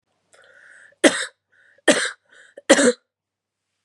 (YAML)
three_cough_length: 3.8 s
three_cough_amplitude: 32767
three_cough_signal_mean_std_ratio: 0.29
survey_phase: beta (2021-08-13 to 2022-03-07)
age: 18-44
gender: Female
wearing_mask: 'No'
symptom_none: true
smoker_status: Ex-smoker
respiratory_condition_asthma: false
respiratory_condition_other: false
recruitment_source: REACT
submission_delay: 1 day
covid_test_result: Negative
covid_test_method: RT-qPCR
influenza_a_test_result: Unknown/Void
influenza_b_test_result: Unknown/Void